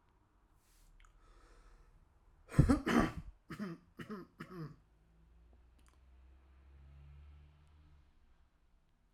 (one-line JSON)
{"three_cough_length": "9.1 s", "three_cough_amplitude": 7281, "three_cough_signal_mean_std_ratio": 0.27, "survey_phase": "alpha (2021-03-01 to 2021-08-12)", "age": "18-44", "gender": "Male", "wearing_mask": "Yes", "symptom_none": true, "smoker_status": "Never smoked", "respiratory_condition_asthma": false, "respiratory_condition_other": false, "recruitment_source": "Test and Trace", "submission_delay": "2 days", "covid_test_result": "Positive", "covid_test_method": "RT-qPCR", "covid_ct_value": 30.0, "covid_ct_gene": "ORF1ab gene", "covid_ct_mean": 30.7, "covid_viral_load": "86 copies/ml", "covid_viral_load_category": "Minimal viral load (< 10K copies/ml)"}